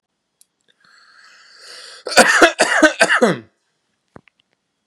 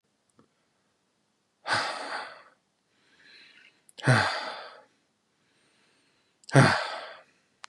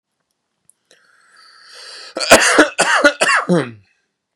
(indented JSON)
{
  "cough_length": "4.9 s",
  "cough_amplitude": 32768,
  "cough_signal_mean_std_ratio": 0.36,
  "exhalation_length": "7.7 s",
  "exhalation_amplitude": 20007,
  "exhalation_signal_mean_std_ratio": 0.3,
  "three_cough_length": "4.4 s",
  "three_cough_amplitude": 32768,
  "three_cough_signal_mean_std_ratio": 0.41,
  "survey_phase": "beta (2021-08-13 to 2022-03-07)",
  "age": "18-44",
  "gender": "Male",
  "wearing_mask": "No",
  "symptom_none": true,
  "smoker_status": "Never smoked",
  "respiratory_condition_asthma": true,
  "respiratory_condition_other": false,
  "recruitment_source": "REACT",
  "submission_delay": "2 days",
  "covid_test_result": "Negative",
  "covid_test_method": "RT-qPCR",
  "influenza_a_test_result": "Negative",
  "influenza_b_test_result": "Negative"
}